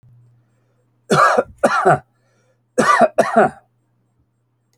{"cough_length": "4.8 s", "cough_amplitude": 32768, "cough_signal_mean_std_ratio": 0.42, "survey_phase": "alpha (2021-03-01 to 2021-08-12)", "age": "65+", "gender": "Male", "wearing_mask": "No", "symptom_none": true, "smoker_status": "Ex-smoker", "respiratory_condition_asthma": false, "respiratory_condition_other": false, "recruitment_source": "REACT", "submission_delay": "1 day", "covid_test_result": "Negative", "covid_test_method": "RT-qPCR"}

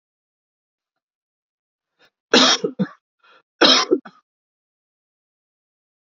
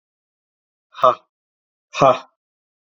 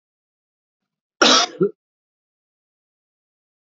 {"three_cough_length": "6.1 s", "three_cough_amplitude": 31521, "three_cough_signal_mean_std_ratio": 0.26, "exhalation_length": "2.9 s", "exhalation_amplitude": 27553, "exhalation_signal_mean_std_ratio": 0.25, "cough_length": "3.8 s", "cough_amplitude": 32768, "cough_signal_mean_std_ratio": 0.24, "survey_phase": "beta (2021-08-13 to 2022-03-07)", "age": "18-44", "gender": "Male", "wearing_mask": "No", "symptom_new_continuous_cough": true, "symptom_runny_or_blocked_nose": true, "symptom_sore_throat": true, "symptom_fever_high_temperature": true, "symptom_headache": true, "symptom_change_to_sense_of_smell_or_taste": true, "symptom_onset": "4 days", "smoker_status": "Never smoked", "respiratory_condition_asthma": false, "respiratory_condition_other": false, "recruitment_source": "Test and Trace", "submission_delay": "2 days", "covid_test_result": "Positive", "covid_test_method": "RT-qPCR"}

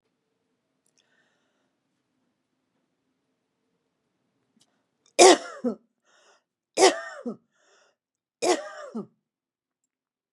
{"three_cough_length": "10.3 s", "three_cough_amplitude": 28404, "three_cough_signal_mean_std_ratio": 0.19, "survey_phase": "beta (2021-08-13 to 2022-03-07)", "age": "65+", "gender": "Female", "wearing_mask": "No", "symptom_none": true, "smoker_status": "Never smoked", "respiratory_condition_asthma": false, "respiratory_condition_other": false, "recruitment_source": "REACT", "submission_delay": "2 days", "covid_test_result": "Negative", "covid_test_method": "RT-qPCR", "influenza_a_test_result": "Negative", "influenza_b_test_result": "Negative"}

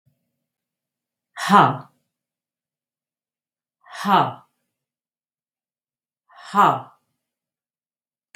{"exhalation_length": "8.4 s", "exhalation_amplitude": 32767, "exhalation_signal_mean_std_ratio": 0.24, "survey_phase": "beta (2021-08-13 to 2022-03-07)", "age": "65+", "gender": "Female", "wearing_mask": "No", "symptom_fatigue": true, "symptom_headache": true, "symptom_onset": "5 days", "smoker_status": "Ex-smoker", "respiratory_condition_asthma": false, "respiratory_condition_other": false, "recruitment_source": "Test and Trace", "submission_delay": "2 days", "covid_test_result": "Positive", "covid_test_method": "RT-qPCR", "covid_ct_value": 19.5, "covid_ct_gene": "N gene", "covid_ct_mean": 20.3, "covid_viral_load": "220000 copies/ml", "covid_viral_load_category": "Low viral load (10K-1M copies/ml)"}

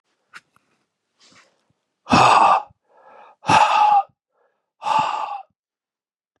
{"exhalation_length": "6.4 s", "exhalation_amplitude": 28640, "exhalation_signal_mean_std_ratio": 0.4, "survey_phase": "beta (2021-08-13 to 2022-03-07)", "age": "45-64", "gender": "Male", "wearing_mask": "No", "symptom_cough_any": true, "symptom_runny_or_blocked_nose": true, "smoker_status": "Never smoked", "respiratory_condition_asthma": false, "respiratory_condition_other": false, "recruitment_source": "Test and Trace", "submission_delay": "2 days", "covid_test_result": "Positive", "covid_test_method": "LFT"}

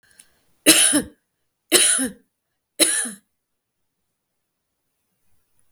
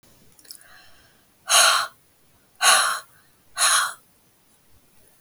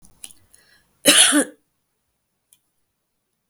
{"three_cough_length": "5.7 s", "three_cough_amplitude": 32768, "three_cough_signal_mean_std_ratio": 0.32, "exhalation_length": "5.2 s", "exhalation_amplitude": 28224, "exhalation_signal_mean_std_ratio": 0.38, "cough_length": "3.5 s", "cough_amplitude": 32768, "cough_signal_mean_std_ratio": 0.27, "survey_phase": "beta (2021-08-13 to 2022-03-07)", "age": "45-64", "gender": "Female", "wearing_mask": "No", "symptom_none": true, "smoker_status": "Ex-smoker", "respiratory_condition_asthma": false, "respiratory_condition_other": false, "recruitment_source": "REACT", "submission_delay": "2 days", "covid_test_result": "Negative", "covid_test_method": "RT-qPCR", "influenza_a_test_result": "Negative", "influenza_b_test_result": "Negative"}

